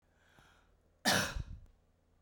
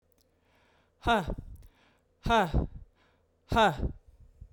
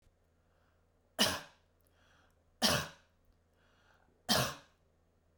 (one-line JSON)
{"cough_length": "2.2 s", "cough_amplitude": 4167, "cough_signal_mean_std_ratio": 0.34, "exhalation_length": "4.5 s", "exhalation_amplitude": 7783, "exhalation_signal_mean_std_ratio": 0.4, "three_cough_length": "5.4 s", "three_cough_amplitude": 5896, "three_cough_signal_mean_std_ratio": 0.29, "survey_phase": "beta (2021-08-13 to 2022-03-07)", "age": "45-64", "gender": "Female", "wearing_mask": "No", "symptom_none": true, "smoker_status": "Never smoked", "respiratory_condition_asthma": false, "respiratory_condition_other": false, "recruitment_source": "REACT", "submission_delay": "1 day", "covid_test_result": "Negative", "covid_test_method": "RT-qPCR"}